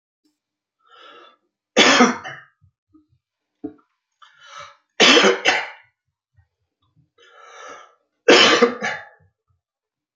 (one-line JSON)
{"three_cough_length": "10.2 s", "three_cough_amplitude": 32768, "three_cough_signal_mean_std_ratio": 0.32, "survey_phase": "beta (2021-08-13 to 2022-03-07)", "age": "65+", "gender": "Male", "wearing_mask": "No", "symptom_cough_any": true, "smoker_status": "Ex-smoker", "respiratory_condition_asthma": false, "respiratory_condition_other": false, "recruitment_source": "REACT", "submission_delay": "3 days", "covid_test_result": "Negative", "covid_test_method": "RT-qPCR", "influenza_a_test_result": "Negative", "influenza_b_test_result": "Negative"}